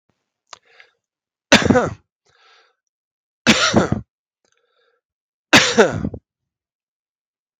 {"three_cough_length": "7.6 s", "three_cough_amplitude": 32768, "three_cough_signal_mean_std_ratio": 0.3, "survey_phase": "beta (2021-08-13 to 2022-03-07)", "age": "45-64", "gender": "Male", "wearing_mask": "No", "symptom_none": true, "smoker_status": "Never smoked", "respiratory_condition_asthma": false, "respiratory_condition_other": false, "recruitment_source": "REACT", "submission_delay": "1 day", "covid_test_result": "Negative", "covid_test_method": "RT-qPCR", "influenza_a_test_result": "Unknown/Void", "influenza_b_test_result": "Unknown/Void"}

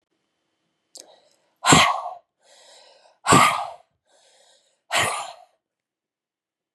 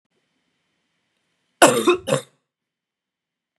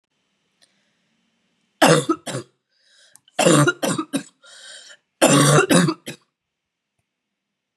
{"exhalation_length": "6.7 s", "exhalation_amplitude": 30087, "exhalation_signal_mean_std_ratio": 0.3, "cough_length": "3.6 s", "cough_amplitude": 32768, "cough_signal_mean_std_ratio": 0.25, "three_cough_length": "7.8 s", "three_cough_amplitude": 31408, "three_cough_signal_mean_std_ratio": 0.37, "survey_phase": "beta (2021-08-13 to 2022-03-07)", "age": "18-44", "gender": "Female", "wearing_mask": "No", "symptom_cough_any": true, "symptom_runny_or_blocked_nose": true, "symptom_shortness_of_breath": true, "symptom_sore_throat": true, "symptom_onset": "5 days", "smoker_status": "Current smoker (1 to 10 cigarettes per day)", "respiratory_condition_asthma": false, "respiratory_condition_other": false, "recruitment_source": "Test and Trace", "submission_delay": "2 days", "covid_test_result": "Positive", "covid_test_method": "RT-qPCR", "covid_ct_value": 23.8, "covid_ct_gene": "ORF1ab gene", "covid_ct_mean": 24.3, "covid_viral_load": "10000 copies/ml", "covid_viral_load_category": "Low viral load (10K-1M copies/ml)"}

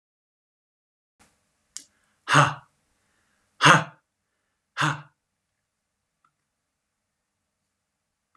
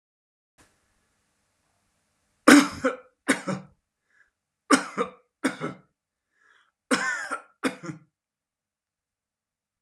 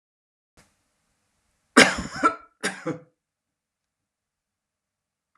{"exhalation_length": "8.4 s", "exhalation_amplitude": 30842, "exhalation_signal_mean_std_ratio": 0.19, "three_cough_length": "9.8 s", "three_cough_amplitude": 30178, "three_cough_signal_mean_std_ratio": 0.24, "cough_length": "5.4 s", "cough_amplitude": 31779, "cough_signal_mean_std_ratio": 0.2, "survey_phase": "alpha (2021-03-01 to 2021-08-12)", "age": "45-64", "gender": "Male", "wearing_mask": "No", "symptom_none": true, "smoker_status": "Ex-smoker", "respiratory_condition_asthma": false, "respiratory_condition_other": false, "recruitment_source": "REACT", "submission_delay": "1 day", "covid_test_result": "Negative", "covid_test_method": "RT-qPCR"}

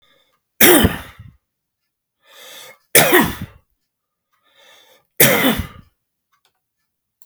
{"three_cough_length": "7.3 s", "three_cough_amplitude": 32768, "three_cough_signal_mean_std_ratio": 0.31, "survey_phase": "alpha (2021-03-01 to 2021-08-12)", "age": "65+", "gender": "Male", "wearing_mask": "No", "symptom_none": true, "smoker_status": "Never smoked", "respiratory_condition_asthma": false, "respiratory_condition_other": false, "recruitment_source": "REACT", "submission_delay": "3 days", "covid_test_result": "Negative", "covid_test_method": "RT-qPCR"}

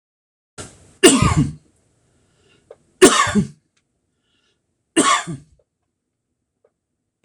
{"three_cough_length": "7.2 s", "three_cough_amplitude": 26028, "three_cough_signal_mean_std_ratio": 0.3, "survey_phase": "alpha (2021-03-01 to 2021-08-12)", "age": "65+", "gender": "Male", "wearing_mask": "No", "symptom_none": true, "smoker_status": "Ex-smoker", "respiratory_condition_asthma": false, "respiratory_condition_other": false, "recruitment_source": "REACT", "submission_delay": "1 day", "covid_test_result": "Negative", "covid_test_method": "RT-qPCR"}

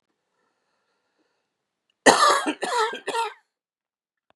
{"cough_length": "4.4 s", "cough_amplitude": 32768, "cough_signal_mean_std_ratio": 0.33, "survey_phase": "beta (2021-08-13 to 2022-03-07)", "age": "18-44", "gender": "Male", "wearing_mask": "No", "symptom_cough_any": true, "symptom_runny_or_blocked_nose": true, "symptom_sore_throat": true, "symptom_headache": true, "symptom_other": true, "symptom_onset": "2 days", "smoker_status": "Ex-smoker", "respiratory_condition_asthma": false, "respiratory_condition_other": false, "recruitment_source": "Test and Trace", "submission_delay": "1 day", "covid_test_result": "Positive", "covid_test_method": "RT-qPCR", "covid_ct_value": 17.8, "covid_ct_gene": "N gene"}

